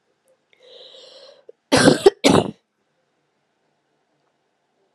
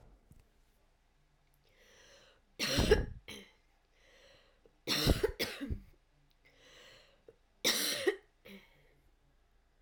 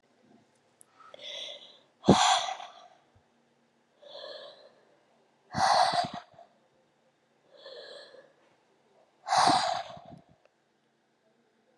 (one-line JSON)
{"cough_length": "4.9 s", "cough_amplitude": 32767, "cough_signal_mean_std_ratio": 0.25, "three_cough_length": "9.8 s", "three_cough_amplitude": 7815, "three_cough_signal_mean_std_ratio": 0.34, "exhalation_length": "11.8 s", "exhalation_amplitude": 17860, "exhalation_signal_mean_std_ratio": 0.32, "survey_phase": "alpha (2021-03-01 to 2021-08-12)", "age": "18-44", "gender": "Female", "wearing_mask": "No", "symptom_cough_any": true, "symptom_shortness_of_breath": true, "symptom_fatigue": true, "symptom_fever_high_temperature": true, "symptom_headache": true, "symptom_change_to_sense_of_smell_or_taste": true, "symptom_loss_of_taste": true, "symptom_onset": "7 days", "smoker_status": "Never smoked", "respiratory_condition_asthma": true, "respiratory_condition_other": false, "recruitment_source": "Test and Trace", "submission_delay": "1 day", "covid_test_result": "Positive", "covid_test_method": "RT-qPCR", "covid_ct_value": 15.8, "covid_ct_gene": "ORF1ab gene", "covid_ct_mean": 17.0, "covid_viral_load": "2600000 copies/ml", "covid_viral_load_category": "High viral load (>1M copies/ml)"}